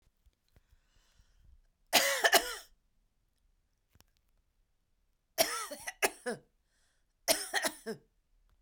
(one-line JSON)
{"three_cough_length": "8.6 s", "three_cough_amplitude": 10929, "three_cough_signal_mean_std_ratio": 0.29, "survey_phase": "beta (2021-08-13 to 2022-03-07)", "age": "45-64", "gender": "Female", "wearing_mask": "No", "symptom_none": true, "smoker_status": "Never smoked", "respiratory_condition_asthma": false, "respiratory_condition_other": false, "recruitment_source": "REACT", "submission_delay": "3 days", "covid_test_result": "Negative", "covid_test_method": "RT-qPCR"}